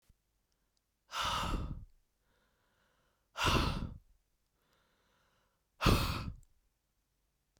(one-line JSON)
{"exhalation_length": "7.6 s", "exhalation_amplitude": 6611, "exhalation_signal_mean_std_ratio": 0.36, "survey_phase": "beta (2021-08-13 to 2022-03-07)", "age": "18-44", "gender": "Female", "wearing_mask": "No", "symptom_cough_any": true, "smoker_status": "Ex-smoker", "respiratory_condition_asthma": false, "respiratory_condition_other": false, "recruitment_source": "Test and Trace", "submission_delay": "1 day", "covid_test_result": "Negative", "covid_test_method": "ePCR"}